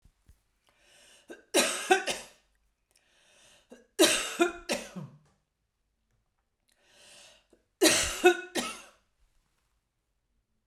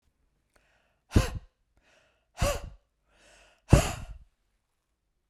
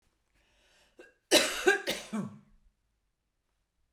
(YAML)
three_cough_length: 10.7 s
three_cough_amplitude: 14182
three_cough_signal_mean_std_ratio: 0.3
exhalation_length: 5.3 s
exhalation_amplitude: 23475
exhalation_signal_mean_std_ratio: 0.23
cough_length: 3.9 s
cough_amplitude: 12367
cough_signal_mean_std_ratio: 0.3
survey_phase: beta (2021-08-13 to 2022-03-07)
age: 45-64
gender: Female
wearing_mask: 'No'
symptom_none: true
smoker_status: Never smoked
respiratory_condition_asthma: false
respiratory_condition_other: false
recruitment_source: REACT
submission_delay: 1 day
covid_test_result: Negative
covid_test_method: RT-qPCR
influenza_a_test_result: Negative
influenza_b_test_result: Negative